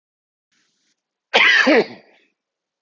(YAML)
cough_length: 2.8 s
cough_amplitude: 31158
cough_signal_mean_std_ratio: 0.36
survey_phase: alpha (2021-03-01 to 2021-08-12)
age: 45-64
gender: Male
wearing_mask: 'No'
symptom_cough_any: true
symptom_shortness_of_breath: true
symptom_fatigue: true
symptom_fever_high_temperature: true
symptom_headache: true
symptom_onset: 5 days
smoker_status: Never smoked
respiratory_condition_asthma: false
respiratory_condition_other: false
recruitment_source: Test and Trace
submission_delay: 2 days
covid_test_result: Positive
covid_test_method: RT-qPCR